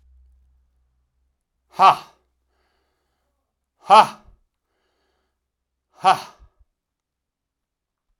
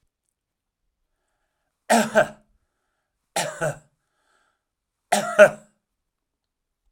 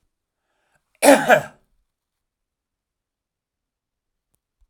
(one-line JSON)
{"exhalation_length": "8.2 s", "exhalation_amplitude": 32767, "exhalation_signal_mean_std_ratio": 0.18, "three_cough_length": "6.9 s", "three_cough_amplitude": 31933, "three_cough_signal_mean_std_ratio": 0.24, "cough_length": "4.7 s", "cough_amplitude": 32768, "cough_signal_mean_std_ratio": 0.21, "survey_phase": "alpha (2021-03-01 to 2021-08-12)", "age": "65+", "gender": "Male", "wearing_mask": "No", "symptom_cough_any": true, "smoker_status": "Never smoked", "respiratory_condition_asthma": false, "respiratory_condition_other": false, "recruitment_source": "REACT", "submission_delay": "2 days", "covid_test_result": "Negative", "covid_test_method": "RT-qPCR"}